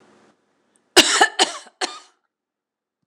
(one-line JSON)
{"cough_length": "3.1 s", "cough_amplitude": 26028, "cough_signal_mean_std_ratio": 0.29, "survey_phase": "beta (2021-08-13 to 2022-03-07)", "age": "65+", "gender": "Female", "wearing_mask": "No", "symptom_headache": true, "symptom_onset": "8 days", "smoker_status": "Never smoked", "respiratory_condition_asthma": false, "respiratory_condition_other": false, "recruitment_source": "REACT", "submission_delay": "0 days", "covid_test_result": "Negative", "covid_test_method": "RT-qPCR", "influenza_a_test_result": "Negative", "influenza_b_test_result": "Negative"}